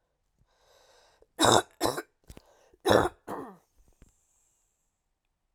three_cough_length: 5.5 s
three_cough_amplitude: 17882
three_cough_signal_mean_std_ratio: 0.26
survey_phase: alpha (2021-03-01 to 2021-08-12)
age: 45-64
gender: Female
wearing_mask: 'No'
symptom_none: true
smoker_status: Never smoked
respiratory_condition_asthma: false
respiratory_condition_other: false
recruitment_source: REACT
submission_delay: 1 day
covid_test_result: Negative
covid_test_method: RT-qPCR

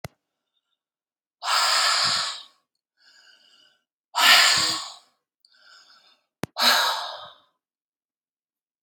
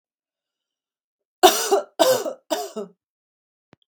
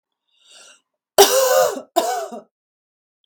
exhalation_length: 8.8 s
exhalation_amplitude: 28779
exhalation_signal_mean_std_ratio: 0.39
three_cough_length: 3.9 s
three_cough_amplitude: 32767
three_cough_signal_mean_std_ratio: 0.32
cough_length: 3.3 s
cough_amplitude: 32768
cough_signal_mean_std_ratio: 0.4
survey_phase: beta (2021-08-13 to 2022-03-07)
age: 45-64
gender: Female
wearing_mask: 'No'
symptom_none: true
smoker_status: Ex-smoker
respiratory_condition_asthma: false
respiratory_condition_other: false
recruitment_source: REACT
submission_delay: 0 days
covid_test_result: Negative
covid_test_method: RT-qPCR
influenza_a_test_result: Negative
influenza_b_test_result: Negative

